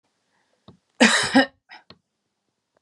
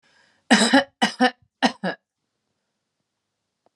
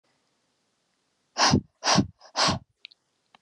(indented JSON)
{
  "cough_length": "2.8 s",
  "cough_amplitude": 32465,
  "cough_signal_mean_std_ratio": 0.29,
  "three_cough_length": "3.8 s",
  "three_cough_amplitude": 31630,
  "three_cough_signal_mean_std_ratio": 0.32,
  "exhalation_length": "3.4 s",
  "exhalation_amplitude": 15828,
  "exhalation_signal_mean_std_ratio": 0.35,
  "survey_phase": "beta (2021-08-13 to 2022-03-07)",
  "age": "18-44",
  "gender": "Female",
  "wearing_mask": "No",
  "symptom_none": true,
  "smoker_status": "Current smoker (1 to 10 cigarettes per day)",
  "respiratory_condition_asthma": true,
  "respiratory_condition_other": false,
  "recruitment_source": "Test and Trace",
  "submission_delay": "2 days",
  "covid_test_result": "Positive",
  "covid_test_method": "RT-qPCR",
  "covid_ct_value": 21.2,
  "covid_ct_gene": "ORF1ab gene"
}